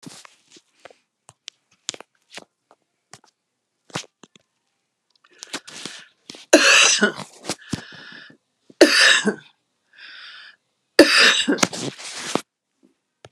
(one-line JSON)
{"three_cough_length": "13.3 s", "three_cough_amplitude": 32768, "three_cough_signal_mean_std_ratio": 0.31, "survey_phase": "beta (2021-08-13 to 2022-03-07)", "age": "65+", "gender": "Female", "wearing_mask": "No", "symptom_none": true, "smoker_status": "Ex-smoker", "respiratory_condition_asthma": false, "respiratory_condition_other": true, "recruitment_source": "REACT", "submission_delay": "3 days", "covid_test_result": "Negative", "covid_test_method": "RT-qPCR"}